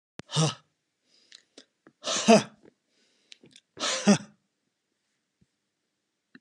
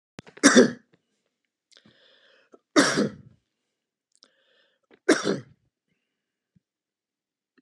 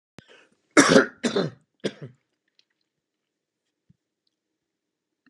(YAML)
exhalation_length: 6.4 s
exhalation_amplitude: 20524
exhalation_signal_mean_std_ratio: 0.26
three_cough_length: 7.6 s
three_cough_amplitude: 25465
three_cough_signal_mean_std_ratio: 0.24
cough_length: 5.3 s
cough_amplitude: 28641
cough_signal_mean_std_ratio: 0.23
survey_phase: alpha (2021-03-01 to 2021-08-12)
age: 65+
gender: Male
wearing_mask: 'No'
symptom_none: true
smoker_status: Never smoked
respiratory_condition_asthma: false
respiratory_condition_other: false
recruitment_source: REACT
submission_delay: 2 days
covid_test_result: Negative
covid_test_method: RT-qPCR